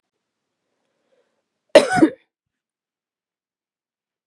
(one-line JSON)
{"cough_length": "4.3 s", "cough_amplitude": 32768, "cough_signal_mean_std_ratio": 0.18, "survey_phase": "beta (2021-08-13 to 2022-03-07)", "age": "45-64", "gender": "Female", "wearing_mask": "No", "symptom_none": true, "smoker_status": "Never smoked", "respiratory_condition_asthma": false, "respiratory_condition_other": false, "recruitment_source": "REACT", "submission_delay": "6 days", "covid_test_result": "Negative", "covid_test_method": "RT-qPCR", "influenza_a_test_result": "Negative", "influenza_b_test_result": "Negative"}